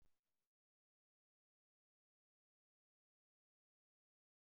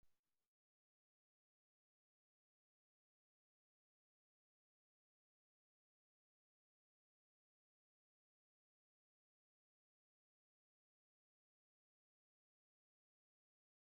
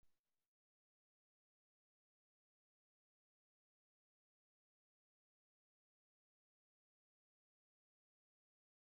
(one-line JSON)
{"cough_length": "4.5 s", "cough_amplitude": 17, "cough_signal_mean_std_ratio": 0.18, "exhalation_length": "13.9 s", "exhalation_amplitude": 17, "exhalation_signal_mean_std_ratio": 0.1, "three_cough_length": "8.9 s", "three_cough_amplitude": 17, "three_cough_signal_mean_std_ratio": 0.13, "survey_phase": "alpha (2021-03-01 to 2021-08-12)", "age": "65+", "gender": "Male", "wearing_mask": "No", "symptom_none": true, "smoker_status": "Ex-smoker", "respiratory_condition_asthma": false, "respiratory_condition_other": true, "recruitment_source": "REACT", "submission_delay": "1 day", "covid_test_result": "Negative", "covid_test_method": "RT-qPCR"}